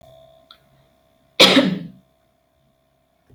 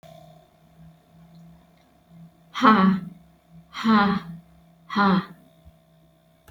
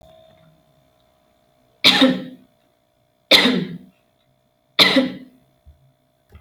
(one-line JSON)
{"cough_length": "3.3 s", "cough_amplitude": 31710, "cough_signal_mean_std_ratio": 0.27, "exhalation_length": "6.5 s", "exhalation_amplitude": 21426, "exhalation_signal_mean_std_ratio": 0.38, "three_cough_length": "6.4 s", "three_cough_amplitude": 30583, "three_cough_signal_mean_std_ratio": 0.32, "survey_phase": "alpha (2021-03-01 to 2021-08-12)", "age": "18-44", "gender": "Female", "wearing_mask": "No", "symptom_none": true, "smoker_status": "Never smoked", "respiratory_condition_asthma": false, "respiratory_condition_other": false, "recruitment_source": "REACT", "submission_delay": "1 day", "covid_test_result": "Negative", "covid_test_method": "RT-qPCR"}